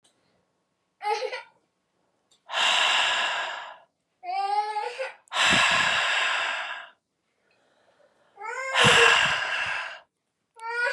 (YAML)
exhalation_length: 10.9 s
exhalation_amplitude: 17493
exhalation_signal_mean_std_ratio: 0.57
survey_phase: beta (2021-08-13 to 2022-03-07)
age: 18-44
gender: Female
wearing_mask: 'No'
symptom_cough_any: true
symptom_new_continuous_cough: true
symptom_runny_or_blocked_nose: true
symptom_shortness_of_breath: true
symptom_sore_throat: true
symptom_diarrhoea: true
symptom_fatigue: true
symptom_headache: true
symptom_change_to_sense_of_smell_or_taste: true
symptom_onset: 3 days
smoker_status: Never smoked
respiratory_condition_asthma: false
respiratory_condition_other: false
recruitment_source: Test and Trace
submission_delay: 1 day
covid_test_result: Positive
covid_test_method: RT-qPCR
covid_ct_value: 21.3
covid_ct_gene: ORF1ab gene